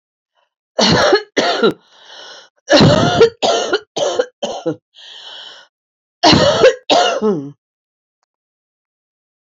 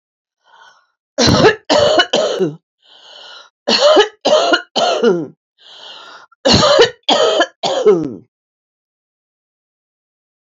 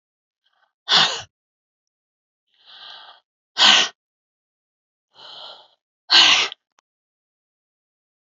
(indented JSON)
{
  "cough_length": "9.6 s",
  "cough_amplitude": 32768,
  "cough_signal_mean_std_ratio": 0.49,
  "three_cough_length": "10.4 s",
  "three_cough_amplitude": 30918,
  "three_cough_signal_mean_std_ratio": 0.51,
  "exhalation_length": "8.4 s",
  "exhalation_amplitude": 32031,
  "exhalation_signal_mean_std_ratio": 0.27,
  "survey_phase": "beta (2021-08-13 to 2022-03-07)",
  "age": "65+",
  "gender": "Female",
  "wearing_mask": "Yes",
  "symptom_sore_throat": true,
  "symptom_fatigue": true,
  "symptom_headache": true,
  "smoker_status": "Ex-smoker",
  "respiratory_condition_asthma": false,
  "respiratory_condition_other": false,
  "recruitment_source": "Test and Trace",
  "submission_delay": "1 day",
  "covid_test_result": "Positive",
  "covid_test_method": "RT-qPCR",
  "covid_ct_value": 16.5,
  "covid_ct_gene": "ORF1ab gene",
  "covid_ct_mean": 16.8,
  "covid_viral_load": "3100000 copies/ml",
  "covid_viral_load_category": "High viral load (>1M copies/ml)"
}